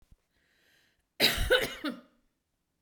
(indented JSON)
{
  "cough_length": "2.8 s",
  "cough_amplitude": 10809,
  "cough_signal_mean_std_ratio": 0.35,
  "survey_phase": "beta (2021-08-13 to 2022-03-07)",
  "age": "45-64",
  "gender": "Female",
  "wearing_mask": "No",
  "symptom_none": true,
  "smoker_status": "Never smoked",
  "respiratory_condition_asthma": false,
  "respiratory_condition_other": false,
  "recruitment_source": "REACT",
  "submission_delay": "2 days",
  "covid_test_result": "Negative",
  "covid_test_method": "RT-qPCR",
  "influenza_a_test_result": "Negative",
  "influenza_b_test_result": "Negative"
}